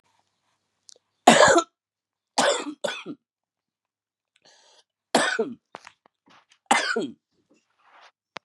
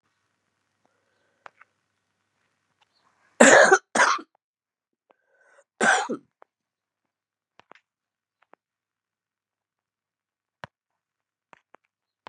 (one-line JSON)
{"three_cough_length": "8.4 s", "three_cough_amplitude": 32768, "three_cough_signal_mean_std_ratio": 0.29, "cough_length": "12.3 s", "cough_amplitude": 32062, "cough_signal_mean_std_ratio": 0.2, "survey_phase": "beta (2021-08-13 to 2022-03-07)", "age": "45-64", "gender": "Female", "wearing_mask": "No", "symptom_runny_or_blocked_nose": true, "symptom_fever_high_temperature": true, "symptom_onset": "3 days", "smoker_status": "Never smoked", "respiratory_condition_asthma": false, "respiratory_condition_other": false, "recruitment_source": "Test and Trace", "submission_delay": "1 day", "covid_test_result": "Positive", "covid_test_method": "RT-qPCR"}